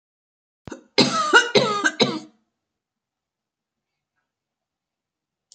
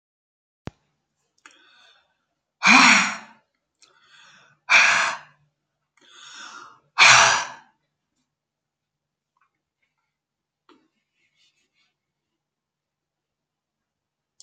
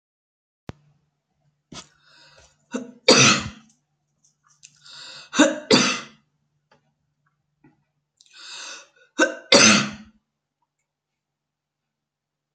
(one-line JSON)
{"cough_length": "5.5 s", "cough_amplitude": 30036, "cough_signal_mean_std_ratio": 0.31, "exhalation_length": "14.4 s", "exhalation_amplitude": 32754, "exhalation_signal_mean_std_ratio": 0.24, "three_cough_length": "12.5 s", "three_cough_amplitude": 32768, "three_cough_signal_mean_std_ratio": 0.27, "survey_phase": "beta (2021-08-13 to 2022-03-07)", "age": "65+", "gender": "Female", "wearing_mask": "No", "symptom_none": true, "smoker_status": "Never smoked", "respiratory_condition_asthma": false, "respiratory_condition_other": false, "recruitment_source": "REACT", "submission_delay": "1 day", "covid_test_result": "Negative", "covid_test_method": "RT-qPCR"}